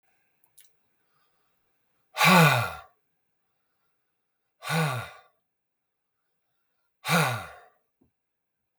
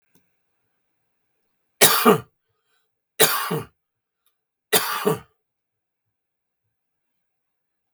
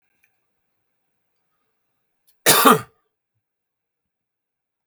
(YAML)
exhalation_length: 8.8 s
exhalation_amplitude: 20886
exhalation_signal_mean_std_ratio: 0.28
three_cough_length: 7.9 s
three_cough_amplitude: 32768
three_cough_signal_mean_std_ratio: 0.26
cough_length: 4.9 s
cough_amplitude: 32768
cough_signal_mean_std_ratio: 0.2
survey_phase: beta (2021-08-13 to 2022-03-07)
age: 65+
gender: Male
wearing_mask: 'No'
symptom_cough_any: true
symptom_fatigue: true
smoker_status: Never smoked
respiratory_condition_asthma: false
respiratory_condition_other: false
recruitment_source: REACT
submission_delay: 1 day
covid_test_result: Negative
covid_test_method: RT-qPCR
influenza_a_test_result: Negative
influenza_b_test_result: Negative